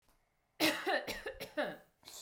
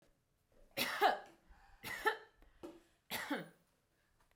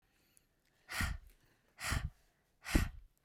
{"cough_length": "2.2 s", "cough_amplitude": 4126, "cough_signal_mean_std_ratio": 0.51, "three_cough_length": "4.4 s", "three_cough_amplitude": 4006, "three_cough_signal_mean_std_ratio": 0.36, "exhalation_length": "3.2 s", "exhalation_amplitude": 6303, "exhalation_signal_mean_std_ratio": 0.37, "survey_phase": "beta (2021-08-13 to 2022-03-07)", "age": "18-44", "gender": "Female", "wearing_mask": "No", "symptom_none": true, "smoker_status": "Never smoked", "respiratory_condition_asthma": false, "respiratory_condition_other": false, "recruitment_source": "REACT", "submission_delay": "1 day", "covid_test_result": "Negative", "covid_test_method": "RT-qPCR"}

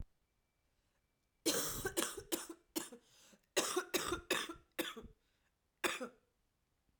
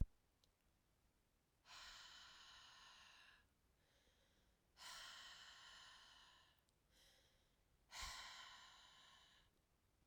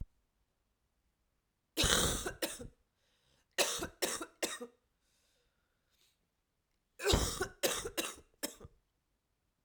{"cough_length": "7.0 s", "cough_amplitude": 3344, "cough_signal_mean_std_ratio": 0.42, "exhalation_length": "10.1 s", "exhalation_amplitude": 1494, "exhalation_signal_mean_std_ratio": 0.37, "three_cough_length": "9.6 s", "three_cough_amplitude": 9477, "three_cough_signal_mean_std_ratio": 0.37, "survey_phase": "alpha (2021-03-01 to 2021-08-12)", "age": "18-44", "gender": "Female", "wearing_mask": "No", "symptom_cough_any": true, "symptom_fatigue": true, "smoker_status": "Ex-smoker", "respiratory_condition_asthma": false, "respiratory_condition_other": false, "recruitment_source": "Test and Trace", "submission_delay": "1 day", "covid_test_result": "Positive", "covid_test_method": "RT-qPCR", "covid_ct_value": 15.5, "covid_ct_gene": "ORF1ab gene", "covid_ct_mean": 15.9, "covid_viral_load": "6200000 copies/ml", "covid_viral_load_category": "High viral load (>1M copies/ml)"}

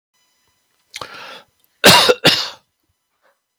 {"cough_length": "3.6 s", "cough_amplitude": 32768, "cough_signal_mean_std_ratio": 0.31, "survey_phase": "beta (2021-08-13 to 2022-03-07)", "age": "65+", "gender": "Male", "wearing_mask": "No", "symptom_none": true, "smoker_status": "Never smoked", "respiratory_condition_asthma": false, "respiratory_condition_other": false, "recruitment_source": "REACT", "submission_delay": "3 days", "covid_test_result": "Negative", "covid_test_method": "RT-qPCR", "influenza_a_test_result": "Negative", "influenza_b_test_result": "Negative"}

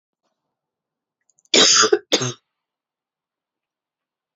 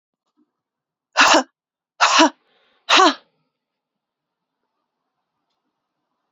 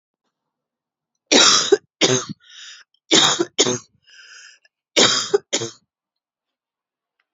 {"cough_length": "4.4 s", "cough_amplitude": 29548, "cough_signal_mean_std_ratio": 0.28, "exhalation_length": "6.3 s", "exhalation_amplitude": 32020, "exhalation_signal_mean_std_ratio": 0.28, "three_cough_length": "7.3 s", "three_cough_amplitude": 32767, "three_cough_signal_mean_std_ratio": 0.37, "survey_phase": "beta (2021-08-13 to 2022-03-07)", "age": "18-44", "gender": "Female", "wearing_mask": "No", "symptom_cough_any": true, "symptom_runny_or_blocked_nose": true, "symptom_sore_throat": true, "symptom_diarrhoea": true, "symptom_headache": true, "smoker_status": "Never smoked", "respiratory_condition_asthma": false, "respiratory_condition_other": false, "recruitment_source": "Test and Trace", "submission_delay": "2 days", "covid_test_result": "Positive", "covid_test_method": "RT-qPCR", "covid_ct_value": 16.6, "covid_ct_gene": "ORF1ab gene", "covid_ct_mean": 17.2, "covid_viral_load": "2300000 copies/ml", "covid_viral_load_category": "High viral load (>1M copies/ml)"}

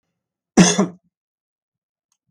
{"cough_length": "2.3 s", "cough_amplitude": 32768, "cough_signal_mean_std_ratio": 0.26, "survey_phase": "beta (2021-08-13 to 2022-03-07)", "age": "65+", "gender": "Male", "wearing_mask": "No", "symptom_none": true, "smoker_status": "Ex-smoker", "respiratory_condition_asthma": false, "respiratory_condition_other": false, "recruitment_source": "REACT", "submission_delay": "3 days", "covid_test_result": "Negative", "covid_test_method": "RT-qPCR", "influenza_a_test_result": "Negative", "influenza_b_test_result": "Negative"}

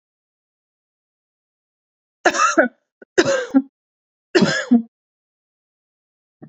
{"three_cough_length": "6.5 s", "three_cough_amplitude": 29867, "three_cough_signal_mean_std_ratio": 0.32, "survey_phase": "beta (2021-08-13 to 2022-03-07)", "age": "18-44", "gender": "Female", "wearing_mask": "No", "symptom_new_continuous_cough": true, "symptom_runny_or_blocked_nose": true, "symptom_fatigue": true, "symptom_headache": true, "symptom_onset": "3 days", "smoker_status": "Never smoked", "respiratory_condition_asthma": false, "respiratory_condition_other": false, "recruitment_source": "Test and Trace", "submission_delay": "2 days", "covid_test_result": "Positive", "covid_test_method": "RT-qPCR", "covid_ct_value": 27.0, "covid_ct_gene": "N gene"}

